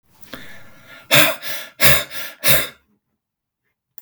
{"exhalation_length": "4.0 s", "exhalation_amplitude": 32768, "exhalation_signal_mean_std_ratio": 0.39, "survey_phase": "beta (2021-08-13 to 2022-03-07)", "age": "45-64", "gender": "Male", "wearing_mask": "No", "symptom_cough_any": true, "symptom_headache": true, "symptom_onset": "4 days", "smoker_status": "Never smoked", "respiratory_condition_asthma": false, "respiratory_condition_other": false, "recruitment_source": "Test and Trace", "submission_delay": "2 days", "covid_test_result": "Negative", "covid_test_method": "RT-qPCR"}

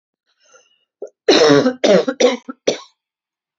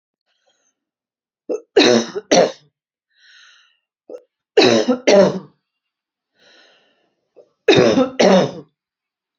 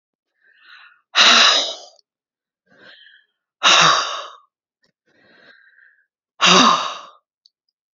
{"cough_length": "3.6 s", "cough_amplitude": 30840, "cough_signal_mean_std_ratio": 0.43, "three_cough_length": "9.4 s", "three_cough_amplitude": 32768, "three_cough_signal_mean_std_ratio": 0.37, "exhalation_length": "7.9 s", "exhalation_amplitude": 32768, "exhalation_signal_mean_std_ratio": 0.36, "survey_phase": "alpha (2021-03-01 to 2021-08-12)", "age": "45-64", "gender": "Female", "wearing_mask": "No", "symptom_none": true, "smoker_status": "Never smoked", "respiratory_condition_asthma": false, "respiratory_condition_other": false, "recruitment_source": "REACT", "submission_delay": "2 days", "covid_test_result": "Negative", "covid_test_method": "RT-qPCR"}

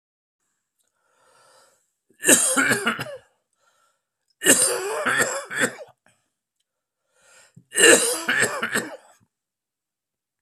{"three_cough_length": "10.4 s", "three_cough_amplitude": 32767, "three_cough_signal_mean_std_ratio": 0.38, "survey_phase": "beta (2021-08-13 to 2022-03-07)", "age": "45-64", "gender": "Male", "wearing_mask": "No", "symptom_cough_any": true, "symptom_sore_throat": true, "symptom_fatigue": true, "symptom_fever_high_temperature": true, "symptom_headache": true, "symptom_onset": "4 days", "smoker_status": "Never smoked", "respiratory_condition_asthma": false, "respiratory_condition_other": false, "recruitment_source": "Test and Trace", "submission_delay": "1 day", "covid_test_result": "Positive", "covid_test_method": "RT-qPCR", "covid_ct_value": 23.8, "covid_ct_gene": "ORF1ab gene", "covid_ct_mean": 24.1, "covid_viral_load": "13000 copies/ml", "covid_viral_load_category": "Low viral load (10K-1M copies/ml)"}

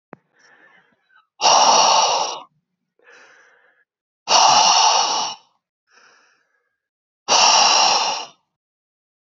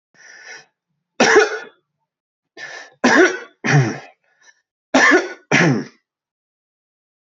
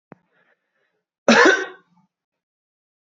{"exhalation_length": "9.4 s", "exhalation_amplitude": 24989, "exhalation_signal_mean_std_ratio": 0.47, "three_cough_length": "7.3 s", "three_cough_amplitude": 29640, "three_cough_signal_mean_std_ratio": 0.4, "cough_length": "3.1 s", "cough_amplitude": 26355, "cough_signal_mean_std_ratio": 0.27, "survey_phase": "beta (2021-08-13 to 2022-03-07)", "age": "18-44", "gender": "Male", "wearing_mask": "No", "symptom_fatigue": true, "smoker_status": "Current smoker (1 to 10 cigarettes per day)", "respiratory_condition_asthma": false, "respiratory_condition_other": false, "recruitment_source": "REACT", "submission_delay": "2 days", "covid_test_result": "Negative", "covid_test_method": "RT-qPCR", "influenza_a_test_result": "Unknown/Void", "influenza_b_test_result": "Unknown/Void"}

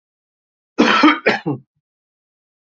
{"cough_length": "2.6 s", "cough_amplitude": 28312, "cough_signal_mean_std_ratio": 0.37, "survey_phase": "beta (2021-08-13 to 2022-03-07)", "age": "45-64", "gender": "Male", "wearing_mask": "No", "symptom_none": true, "smoker_status": "Ex-smoker", "respiratory_condition_asthma": false, "respiratory_condition_other": false, "recruitment_source": "Test and Trace", "submission_delay": "1 day", "covid_test_result": "Positive", "covid_test_method": "ePCR"}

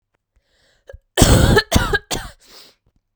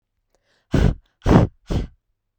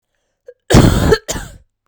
{"three_cough_length": "3.2 s", "three_cough_amplitude": 32768, "three_cough_signal_mean_std_ratio": 0.4, "exhalation_length": "2.4 s", "exhalation_amplitude": 32768, "exhalation_signal_mean_std_ratio": 0.38, "cough_length": "1.9 s", "cough_amplitude": 32768, "cough_signal_mean_std_ratio": 0.43, "survey_phase": "beta (2021-08-13 to 2022-03-07)", "age": "18-44", "gender": "Female", "wearing_mask": "No", "symptom_cough_any": true, "symptom_runny_or_blocked_nose": true, "symptom_sore_throat": true, "symptom_diarrhoea": true, "symptom_fatigue": true, "symptom_headache": true, "symptom_onset": "4 days", "smoker_status": "Never smoked", "respiratory_condition_asthma": false, "respiratory_condition_other": false, "recruitment_source": "Test and Trace", "submission_delay": "1 day", "covid_test_result": "Positive", "covid_test_method": "RT-qPCR", "covid_ct_value": 21.9, "covid_ct_gene": "ORF1ab gene", "covid_ct_mean": 22.3, "covid_viral_load": "49000 copies/ml", "covid_viral_load_category": "Low viral load (10K-1M copies/ml)"}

